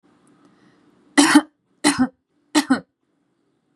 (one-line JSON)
{"three_cough_length": "3.8 s", "three_cough_amplitude": 32573, "three_cough_signal_mean_std_ratio": 0.31, "survey_phase": "beta (2021-08-13 to 2022-03-07)", "age": "18-44", "gender": "Female", "wearing_mask": "No", "symptom_runny_or_blocked_nose": true, "symptom_sore_throat": true, "symptom_fatigue": true, "symptom_fever_high_temperature": true, "symptom_onset": "3 days", "smoker_status": "Never smoked", "respiratory_condition_asthma": false, "respiratory_condition_other": false, "recruitment_source": "Test and Trace", "submission_delay": "-2 days", "covid_test_result": "Positive", "covid_test_method": "RT-qPCR", "covid_ct_value": 18.2, "covid_ct_gene": "N gene", "covid_ct_mean": 19.0, "covid_viral_load": "570000 copies/ml", "covid_viral_load_category": "Low viral load (10K-1M copies/ml)"}